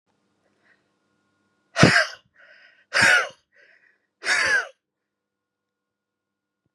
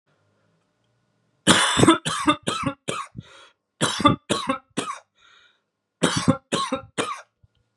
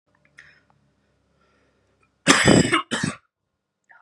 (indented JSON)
{
  "exhalation_length": "6.7 s",
  "exhalation_amplitude": 32767,
  "exhalation_signal_mean_std_ratio": 0.3,
  "three_cough_length": "7.8 s",
  "three_cough_amplitude": 32337,
  "three_cough_signal_mean_std_ratio": 0.41,
  "cough_length": "4.0 s",
  "cough_amplitude": 32258,
  "cough_signal_mean_std_ratio": 0.31,
  "survey_phase": "beta (2021-08-13 to 2022-03-07)",
  "age": "18-44",
  "gender": "Male",
  "wearing_mask": "No",
  "symptom_none": true,
  "smoker_status": "Never smoked",
  "respiratory_condition_asthma": false,
  "respiratory_condition_other": false,
  "recruitment_source": "REACT",
  "submission_delay": "1 day",
  "covid_test_result": "Negative",
  "covid_test_method": "RT-qPCR",
  "influenza_a_test_result": "Negative",
  "influenza_b_test_result": "Negative"
}